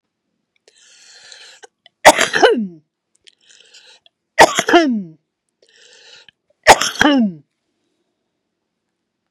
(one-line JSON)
{"three_cough_length": "9.3 s", "three_cough_amplitude": 32768, "three_cough_signal_mean_std_ratio": 0.3, "survey_phase": "beta (2021-08-13 to 2022-03-07)", "age": "65+", "gender": "Female", "wearing_mask": "No", "symptom_cough_any": true, "smoker_status": "Ex-smoker", "respiratory_condition_asthma": false, "respiratory_condition_other": true, "recruitment_source": "REACT", "submission_delay": "2 days", "covid_test_result": "Negative", "covid_test_method": "RT-qPCR", "influenza_a_test_result": "Negative", "influenza_b_test_result": "Negative"}